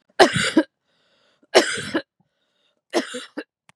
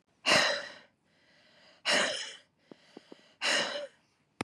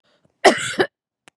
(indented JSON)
{
  "three_cough_length": "3.8 s",
  "three_cough_amplitude": 32767,
  "three_cough_signal_mean_std_ratio": 0.33,
  "exhalation_length": "4.4 s",
  "exhalation_amplitude": 10978,
  "exhalation_signal_mean_std_ratio": 0.43,
  "cough_length": "1.4 s",
  "cough_amplitude": 32767,
  "cough_signal_mean_std_ratio": 0.33,
  "survey_phase": "beta (2021-08-13 to 2022-03-07)",
  "age": "45-64",
  "gender": "Female",
  "wearing_mask": "No",
  "symptom_none": true,
  "smoker_status": "Ex-smoker",
  "respiratory_condition_asthma": false,
  "respiratory_condition_other": false,
  "recruitment_source": "REACT",
  "submission_delay": "1 day",
  "covid_test_result": "Negative",
  "covid_test_method": "RT-qPCR",
  "influenza_a_test_result": "Negative",
  "influenza_b_test_result": "Negative"
}